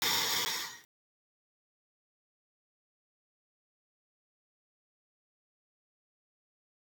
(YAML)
exhalation_length: 6.9 s
exhalation_amplitude: 4098
exhalation_signal_mean_std_ratio: 0.25
survey_phase: beta (2021-08-13 to 2022-03-07)
age: 18-44
gender: Male
wearing_mask: 'No'
symptom_cough_any: true
symptom_runny_or_blocked_nose: true
symptom_change_to_sense_of_smell_or_taste: true
symptom_loss_of_taste: true
symptom_onset: 3 days
smoker_status: Ex-smoker
respiratory_condition_asthma: false
respiratory_condition_other: false
recruitment_source: Test and Trace
submission_delay: 1 day
covid_test_result: Positive
covid_test_method: RT-qPCR